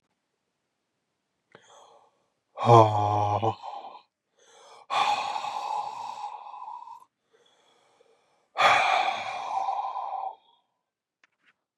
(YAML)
exhalation_length: 11.8 s
exhalation_amplitude: 23317
exhalation_signal_mean_std_ratio: 0.4
survey_phase: beta (2021-08-13 to 2022-03-07)
age: 18-44
gender: Male
wearing_mask: 'No'
symptom_cough_any: true
symptom_new_continuous_cough: true
symptom_runny_or_blocked_nose: true
symptom_sore_throat: true
symptom_fatigue: true
symptom_fever_high_temperature: true
symptom_headache: true
symptom_change_to_sense_of_smell_or_taste: true
symptom_onset: 3 days
smoker_status: Never smoked
respiratory_condition_asthma: false
respiratory_condition_other: false
recruitment_source: Test and Trace
submission_delay: 2 days
covid_test_result: Positive
covid_test_method: RT-qPCR
covid_ct_value: 20.6
covid_ct_gene: ORF1ab gene